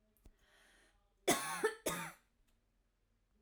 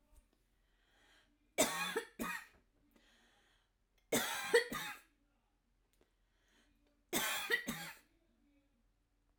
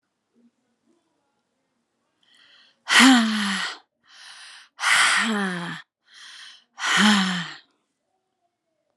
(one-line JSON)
{"cough_length": "3.4 s", "cough_amplitude": 3732, "cough_signal_mean_std_ratio": 0.33, "three_cough_length": "9.4 s", "three_cough_amplitude": 4790, "three_cough_signal_mean_std_ratio": 0.34, "exhalation_length": "9.0 s", "exhalation_amplitude": 30011, "exhalation_signal_mean_std_ratio": 0.4, "survey_phase": "alpha (2021-03-01 to 2021-08-12)", "age": "45-64", "gender": "Female", "wearing_mask": "No", "symptom_cough_any": true, "symptom_fatigue": true, "symptom_onset": "12 days", "smoker_status": "Never smoked", "respiratory_condition_asthma": false, "respiratory_condition_other": false, "recruitment_source": "REACT", "submission_delay": "2 days", "covid_test_result": "Negative", "covid_test_method": "RT-qPCR"}